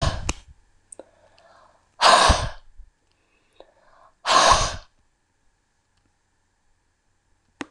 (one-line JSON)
{"exhalation_length": "7.7 s", "exhalation_amplitude": 26018, "exhalation_signal_mean_std_ratio": 0.31, "survey_phase": "beta (2021-08-13 to 2022-03-07)", "age": "65+", "gender": "Female", "wearing_mask": "No", "symptom_cough_any": true, "symptom_fatigue": true, "symptom_other": true, "symptom_onset": "4 days", "smoker_status": "Ex-smoker", "respiratory_condition_asthma": false, "respiratory_condition_other": false, "recruitment_source": "Test and Trace", "submission_delay": "1 day", "covid_test_result": "Positive", "covid_test_method": "ePCR"}